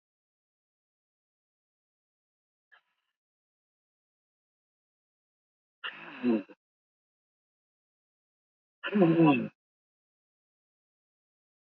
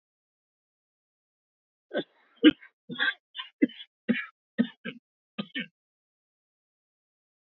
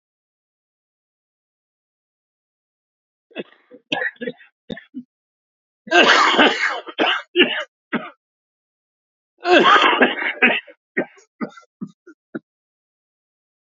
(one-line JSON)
{"exhalation_length": "11.8 s", "exhalation_amplitude": 8828, "exhalation_signal_mean_std_ratio": 0.21, "cough_length": "7.5 s", "cough_amplitude": 17264, "cough_signal_mean_std_ratio": 0.21, "three_cough_length": "13.7 s", "three_cough_amplitude": 32555, "three_cough_signal_mean_std_ratio": 0.35, "survey_phase": "beta (2021-08-13 to 2022-03-07)", "age": "65+", "gender": "Male", "wearing_mask": "No", "symptom_cough_any": true, "symptom_runny_or_blocked_nose": true, "symptom_shortness_of_breath": true, "smoker_status": "Ex-smoker", "respiratory_condition_asthma": false, "respiratory_condition_other": false, "recruitment_source": "REACT", "submission_delay": "3 days", "covid_test_result": "Negative", "covid_test_method": "RT-qPCR", "influenza_a_test_result": "Negative", "influenza_b_test_result": "Negative"}